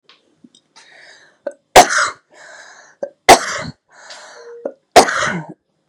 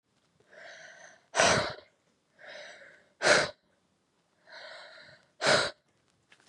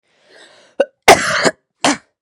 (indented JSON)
{
  "three_cough_length": "5.9 s",
  "three_cough_amplitude": 32768,
  "three_cough_signal_mean_std_ratio": 0.3,
  "exhalation_length": "6.5 s",
  "exhalation_amplitude": 14932,
  "exhalation_signal_mean_std_ratio": 0.33,
  "cough_length": "2.2 s",
  "cough_amplitude": 32768,
  "cough_signal_mean_std_ratio": 0.36,
  "survey_phase": "beta (2021-08-13 to 2022-03-07)",
  "age": "18-44",
  "gender": "Female",
  "wearing_mask": "No",
  "symptom_none": true,
  "symptom_onset": "4 days",
  "smoker_status": "Current smoker (1 to 10 cigarettes per day)",
  "respiratory_condition_asthma": false,
  "respiratory_condition_other": false,
  "recruitment_source": "REACT",
  "submission_delay": "0 days",
  "covid_test_result": "Negative",
  "covid_test_method": "RT-qPCR",
  "influenza_a_test_result": "Negative",
  "influenza_b_test_result": "Negative"
}